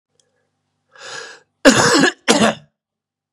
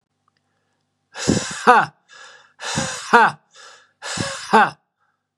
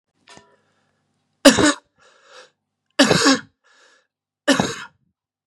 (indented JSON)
{
  "cough_length": "3.3 s",
  "cough_amplitude": 32768,
  "cough_signal_mean_std_ratio": 0.38,
  "exhalation_length": "5.4 s",
  "exhalation_amplitude": 32767,
  "exhalation_signal_mean_std_ratio": 0.37,
  "three_cough_length": "5.5 s",
  "three_cough_amplitude": 32768,
  "three_cough_signal_mean_std_ratio": 0.3,
  "survey_phase": "beta (2021-08-13 to 2022-03-07)",
  "age": "45-64",
  "gender": "Male",
  "wearing_mask": "No",
  "symptom_cough_any": true,
  "symptom_runny_or_blocked_nose": true,
  "symptom_headache": true,
  "smoker_status": "Never smoked",
  "respiratory_condition_asthma": false,
  "respiratory_condition_other": false,
  "recruitment_source": "Test and Trace",
  "submission_delay": "1 day",
  "covid_test_result": "Positive",
  "covid_test_method": "LFT"
}